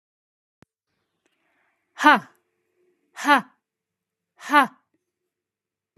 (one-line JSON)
{"exhalation_length": "6.0 s", "exhalation_amplitude": 27373, "exhalation_signal_mean_std_ratio": 0.22, "survey_phase": "beta (2021-08-13 to 2022-03-07)", "age": "18-44", "gender": "Female", "wearing_mask": "No", "symptom_none": true, "smoker_status": "Never smoked", "respiratory_condition_asthma": false, "respiratory_condition_other": false, "recruitment_source": "REACT", "submission_delay": "7 days", "covid_test_result": "Negative", "covid_test_method": "RT-qPCR", "influenza_a_test_result": "Negative", "influenza_b_test_result": "Negative"}